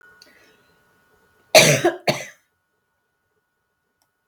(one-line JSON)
{"cough_length": "4.3 s", "cough_amplitude": 32768, "cough_signal_mean_std_ratio": 0.24, "survey_phase": "beta (2021-08-13 to 2022-03-07)", "age": "65+", "gender": "Female", "wearing_mask": "No", "symptom_sore_throat": true, "symptom_onset": "12 days", "smoker_status": "Ex-smoker", "respiratory_condition_asthma": false, "respiratory_condition_other": false, "recruitment_source": "REACT", "submission_delay": "3 days", "covid_test_result": "Negative", "covid_test_method": "RT-qPCR"}